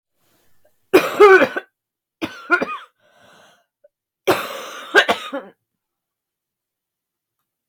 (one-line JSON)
{"cough_length": "7.7 s", "cough_amplitude": 32768, "cough_signal_mean_std_ratio": 0.29, "survey_phase": "beta (2021-08-13 to 2022-03-07)", "age": "45-64", "gender": "Female", "wearing_mask": "No", "symptom_cough_any": true, "symptom_new_continuous_cough": true, "symptom_runny_or_blocked_nose": true, "symptom_sore_throat": true, "symptom_fatigue": true, "symptom_fever_high_temperature": true, "symptom_headache": true, "symptom_change_to_sense_of_smell_or_taste": true, "symptom_onset": "5 days", "smoker_status": "Never smoked", "respiratory_condition_asthma": false, "respiratory_condition_other": false, "recruitment_source": "Test and Trace", "submission_delay": "2 days", "covid_test_result": "Positive", "covid_test_method": "ePCR"}